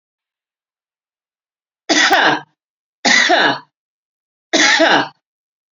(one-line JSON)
{"three_cough_length": "5.7 s", "three_cough_amplitude": 32767, "three_cough_signal_mean_std_ratio": 0.44, "survey_phase": "beta (2021-08-13 to 2022-03-07)", "age": "45-64", "gender": "Female", "wearing_mask": "No", "symptom_none": true, "smoker_status": "Current smoker (11 or more cigarettes per day)", "respiratory_condition_asthma": true, "respiratory_condition_other": true, "recruitment_source": "REACT", "submission_delay": "12 days", "covid_test_result": "Negative", "covid_test_method": "RT-qPCR"}